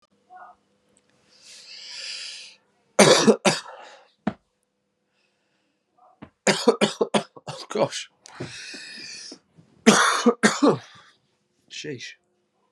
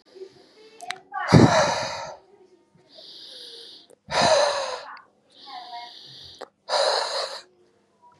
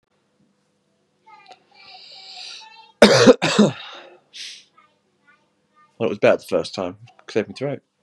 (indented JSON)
{
  "three_cough_length": "12.7 s",
  "three_cough_amplitude": 32634,
  "three_cough_signal_mean_std_ratio": 0.33,
  "exhalation_length": "8.2 s",
  "exhalation_amplitude": 30018,
  "exhalation_signal_mean_std_ratio": 0.41,
  "cough_length": "8.0 s",
  "cough_amplitude": 32768,
  "cough_signal_mean_std_ratio": 0.31,
  "survey_phase": "beta (2021-08-13 to 2022-03-07)",
  "age": "18-44",
  "gender": "Male",
  "wearing_mask": "No",
  "symptom_cough_any": true,
  "symptom_runny_or_blocked_nose": true,
  "symptom_sore_throat": true,
  "symptom_abdominal_pain": true,
  "symptom_onset": "2 days",
  "smoker_status": "Never smoked",
  "respiratory_condition_asthma": false,
  "respiratory_condition_other": false,
  "recruitment_source": "REACT",
  "submission_delay": "1 day",
  "covid_test_result": "Positive",
  "covid_test_method": "RT-qPCR",
  "covid_ct_value": 22.0,
  "covid_ct_gene": "E gene",
  "influenza_a_test_result": "Unknown/Void",
  "influenza_b_test_result": "Unknown/Void"
}